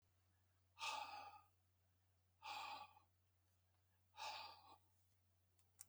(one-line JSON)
{"exhalation_length": "5.9 s", "exhalation_amplitude": 551, "exhalation_signal_mean_std_ratio": 0.47, "survey_phase": "beta (2021-08-13 to 2022-03-07)", "age": "45-64", "gender": "Male", "wearing_mask": "No", "symptom_other": true, "smoker_status": "Never smoked", "respiratory_condition_asthma": false, "respiratory_condition_other": false, "recruitment_source": "Test and Trace", "submission_delay": "2 days", "covid_test_result": "Positive", "covid_test_method": "RT-qPCR", "covid_ct_value": 18.4, "covid_ct_gene": "ORF1ab gene"}